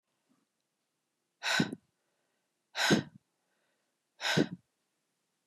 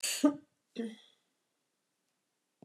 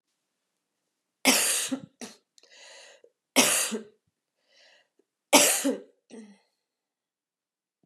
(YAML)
exhalation_length: 5.5 s
exhalation_amplitude: 6797
exhalation_signal_mean_std_ratio: 0.29
cough_length: 2.6 s
cough_amplitude: 6035
cough_signal_mean_std_ratio: 0.27
three_cough_length: 7.9 s
three_cough_amplitude: 24594
three_cough_signal_mean_std_ratio: 0.31
survey_phase: beta (2021-08-13 to 2022-03-07)
age: 45-64
gender: Female
wearing_mask: 'No'
symptom_cough_any: true
symptom_runny_or_blocked_nose: true
symptom_fatigue: true
symptom_change_to_sense_of_smell_or_taste: true
symptom_onset: 3 days
smoker_status: Never smoked
respiratory_condition_asthma: false
respiratory_condition_other: false
recruitment_source: Test and Trace
submission_delay: 1 day
covid_test_result: Positive
covid_test_method: RT-qPCR
covid_ct_value: 19.1
covid_ct_gene: ORF1ab gene
covid_ct_mean: 19.2
covid_viral_load: 520000 copies/ml
covid_viral_load_category: Low viral load (10K-1M copies/ml)